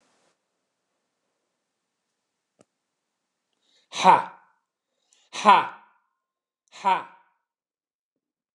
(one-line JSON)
{"exhalation_length": "8.5 s", "exhalation_amplitude": 25467, "exhalation_signal_mean_std_ratio": 0.2, "survey_phase": "beta (2021-08-13 to 2022-03-07)", "age": "65+", "gender": "Male", "wearing_mask": "No", "symptom_fatigue": true, "smoker_status": "Ex-smoker", "respiratory_condition_asthma": false, "respiratory_condition_other": false, "recruitment_source": "REACT", "submission_delay": "2 days", "covid_test_result": "Negative", "covid_test_method": "RT-qPCR"}